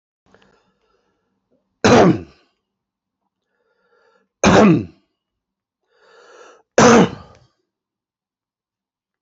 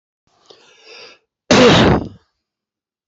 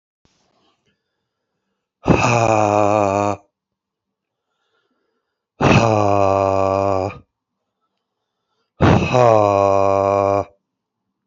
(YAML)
three_cough_length: 9.2 s
three_cough_amplitude: 31507
three_cough_signal_mean_std_ratio: 0.28
cough_length: 3.1 s
cough_amplitude: 29598
cough_signal_mean_std_ratio: 0.37
exhalation_length: 11.3 s
exhalation_amplitude: 30833
exhalation_signal_mean_std_ratio: 0.45
survey_phase: beta (2021-08-13 to 2022-03-07)
age: 45-64
gender: Male
wearing_mask: 'No'
symptom_none: true
smoker_status: Ex-smoker
respiratory_condition_asthma: false
respiratory_condition_other: false
recruitment_source: Test and Trace
submission_delay: 1 day
covid_test_result: Positive
covid_test_method: RT-qPCR
covid_ct_value: 31.0
covid_ct_gene: ORF1ab gene
covid_ct_mean: 31.9
covid_viral_load: 36 copies/ml
covid_viral_load_category: Minimal viral load (< 10K copies/ml)